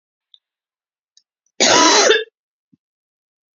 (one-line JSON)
{"cough_length": "3.6 s", "cough_amplitude": 31649, "cough_signal_mean_std_ratio": 0.34, "survey_phase": "beta (2021-08-13 to 2022-03-07)", "age": "45-64", "gender": "Female", "wearing_mask": "No", "symptom_cough_any": true, "symptom_shortness_of_breath": true, "symptom_fatigue": true, "symptom_headache": true, "symptom_change_to_sense_of_smell_or_taste": true, "symptom_loss_of_taste": true, "symptom_onset": "5 days", "smoker_status": "Never smoked", "respiratory_condition_asthma": false, "respiratory_condition_other": false, "recruitment_source": "Test and Trace", "submission_delay": "1 day", "covid_test_result": "Positive", "covid_test_method": "RT-qPCR", "covid_ct_value": 17.8, "covid_ct_gene": "ORF1ab gene", "covid_ct_mean": 18.2, "covid_viral_load": "1000000 copies/ml", "covid_viral_load_category": "High viral load (>1M copies/ml)"}